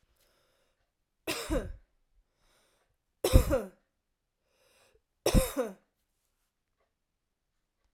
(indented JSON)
{
  "three_cough_length": "7.9 s",
  "three_cough_amplitude": 16560,
  "three_cough_signal_mean_std_ratio": 0.24,
  "survey_phase": "alpha (2021-03-01 to 2021-08-12)",
  "age": "18-44",
  "gender": "Female",
  "wearing_mask": "No",
  "symptom_none": true,
  "smoker_status": "Ex-smoker",
  "respiratory_condition_asthma": true,
  "respiratory_condition_other": false,
  "recruitment_source": "REACT",
  "submission_delay": "3 days",
  "covid_test_result": "Negative",
  "covid_test_method": "RT-qPCR"
}